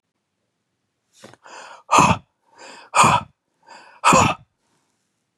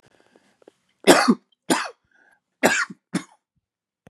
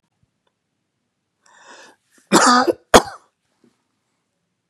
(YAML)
exhalation_length: 5.4 s
exhalation_amplitude: 30602
exhalation_signal_mean_std_ratio: 0.32
three_cough_length: 4.1 s
three_cough_amplitude: 32768
three_cough_signal_mean_std_ratio: 0.3
cough_length: 4.7 s
cough_amplitude: 32768
cough_signal_mean_std_ratio: 0.25
survey_phase: beta (2021-08-13 to 2022-03-07)
age: 18-44
gender: Male
wearing_mask: 'No'
symptom_cough_any: true
symptom_runny_or_blocked_nose: true
symptom_sore_throat: true
symptom_fatigue: true
symptom_headache: true
smoker_status: Never smoked
respiratory_condition_asthma: false
respiratory_condition_other: false
recruitment_source: Test and Trace
submission_delay: 0 days
covid_test_result: Negative
covid_test_method: LFT